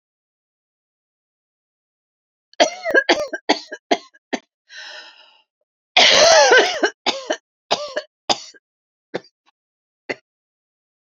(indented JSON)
{
  "three_cough_length": "11.0 s",
  "three_cough_amplitude": 32087,
  "three_cough_signal_mean_std_ratio": 0.32,
  "survey_phase": "beta (2021-08-13 to 2022-03-07)",
  "age": "18-44",
  "gender": "Female",
  "wearing_mask": "No",
  "symptom_cough_any": true,
  "symptom_runny_or_blocked_nose": true,
  "symptom_shortness_of_breath": true,
  "symptom_sore_throat": true,
  "symptom_fatigue": true,
  "symptom_headache": true,
  "symptom_onset": "3 days",
  "smoker_status": "Never smoked",
  "respiratory_condition_asthma": false,
  "respiratory_condition_other": false,
  "recruitment_source": "REACT",
  "submission_delay": "1 day",
  "covid_test_result": "Negative",
  "covid_test_method": "RT-qPCR",
  "influenza_a_test_result": "Positive",
  "influenza_a_ct_value": 34.0,
  "influenza_b_test_result": "Negative"
}